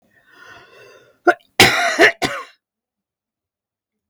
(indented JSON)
{
  "cough_length": "4.1 s",
  "cough_amplitude": 32768,
  "cough_signal_mean_std_ratio": 0.31,
  "survey_phase": "beta (2021-08-13 to 2022-03-07)",
  "age": "65+",
  "gender": "Female",
  "wearing_mask": "No",
  "symptom_cough_any": true,
  "symptom_runny_or_blocked_nose": true,
  "symptom_shortness_of_breath": true,
  "smoker_status": "Ex-smoker",
  "respiratory_condition_asthma": false,
  "respiratory_condition_other": true,
  "recruitment_source": "REACT",
  "submission_delay": "2 days",
  "covid_test_result": "Negative",
  "covid_test_method": "RT-qPCR",
  "influenza_a_test_result": "Negative",
  "influenza_b_test_result": "Negative"
}